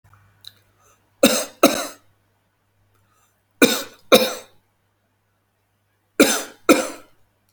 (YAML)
three_cough_length: 7.5 s
three_cough_amplitude: 32509
three_cough_signal_mean_std_ratio: 0.28
survey_phase: alpha (2021-03-01 to 2021-08-12)
age: 45-64
gender: Male
wearing_mask: 'No'
symptom_none: true
smoker_status: Ex-smoker
respiratory_condition_asthma: false
respiratory_condition_other: false
recruitment_source: REACT
submission_delay: 3 days
covid_test_result: Negative
covid_test_method: RT-qPCR